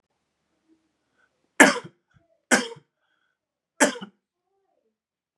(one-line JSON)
{"three_cough_length": "5.4 s", "three_cough_amplitude": 32730, "three_cough_signal_mean_std_ratio": 0.2, "survey_phase": "beta (2021-08-13 to 2022-03-07)", "age": "18-44", "gender": "Male", "wearing_mask": "No", "symptom_cough_any": true, "symptom_sore_throat": true, "symptom_fatigue": true, "symptom_fever_high_temperature": true, "symptom_headache": true, "smoker_status": "Never smoked", "respiratory_condition_asthma": false, "respiratory_condition_other": false, "recruitment_source": "Test and Trace", "submission_delay": "2 days", "covid_test_result": "Positive", "covid_test_method": "RT-qPCR", "covid_ct_value": 23.4, "covid_ct_gene": "S gene"}